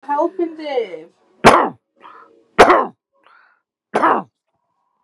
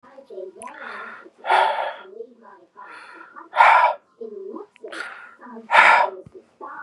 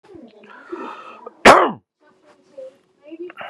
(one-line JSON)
{"three_cough_length": "5.0 s", "three_cough_amplitude": 32768, "three_cough_signal_mean_std_ratio": 0.37, "exhalation_length": "6.8 s", "exhalation_amplitude": 32767, "exhalation_signal_mean_std_ratio": 0.41, "cough_length": "3.5 s", "cough_amplitude": 32768, "cough_signal_mean_std_ratio": 0.26, "survey_phase": "beta (2021-08-13 to 2022-03-07)", "age": "18-44", "gender": "Male", "wearing_mask": "No", "symptom_none": true, "smoker_status": "Never smoked", "respiratory_condition_asthma": false, "respiratory_condition_other": false, "recruitment_source": "REACT", "submission_delay": "2 days", "covid_test_result": "Negative", "covid_test_method": "RT-qPCR", "influenza_a_test_result": "Negative", "influenza_b_test_result": "Negative"}